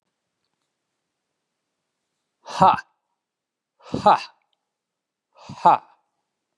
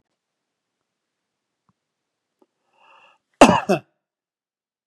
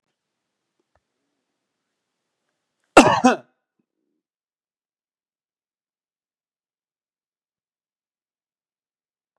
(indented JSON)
{
  "exhalation_length": "6.6 s",
  "exhalation_amplitude": 28214,
  "exhalation_signal_mean_std_ratio": 0.22,
  "cough_length": "4.9 s",
  "cough_amplitude": 32768,
  "cough_signal_mean_std_ratio": 0.16,
  "three_cough_length": "9.4 s",
  "three_cough_amplitude": 32768,
  "three_cough_signal_mean_std_ratio": 0.13,
  "survey_phase": "beta (2021-08-13 to 2022-03-07)",
  "age": "45-64",
  "gender": "Male",
  "wearing_mask": "No",
  "symptom_none": true,
  "smoker_status": "Never smoked",
  "respiratory_condition_asthma": false,
  "respiratory_condition_other": false,
  "recruitment_source": "REACT",
  "submission_delay": "1 day",
  "covid_test_result": "Negative",
  "covid_test_method": "RT-qPCR"
}